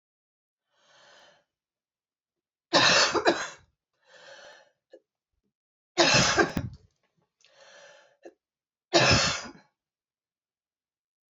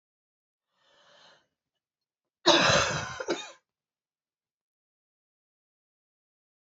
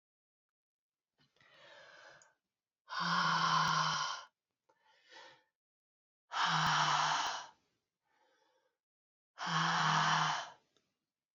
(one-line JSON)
{"three_cough_length": "11.3 s", "three_cough_amplitude": 16559, "three_cough_signal_mean_std_ratio": 0.32, "cough_length": "6.7 s", "cough_amplitude": 16913, "cough_signal_mean_std_ratio": 0.25, "exhalation_length": "11.3 s", "exhalation_amplitude": 3849, "exhalation_signal_mean_std_ratio": 0.48, "survey_phase": "beta (2021-08-13 to 2022-03-07)", "age": "45-64", "gender": "Female", "wearing_mask": "No", "symptom_cough_any": true, "symptom_runny_or_blocked_nose": true, "symptom_fatigue": true, "symptom_headache": true, "symptom_other": true, "symptom_onset": "4 days", "smoker_status": "Never smoked", "respiratory_condition_asthma": false, "respiratory_condition_other": false, "recruitment_source": "Test and Trace", "submission_delay": "2 days", "covid_test_result": "Positive", "covid_test_method": "RT-qPCR", "covid_ct_value": 14.2, "covid_ct_gene": "S gene", "covid_ct_mean": 14.5, "covid_viral_load": "18000000 copies/ml", "covid_viral_load_category": "High viral load (>1M copies/ml)"}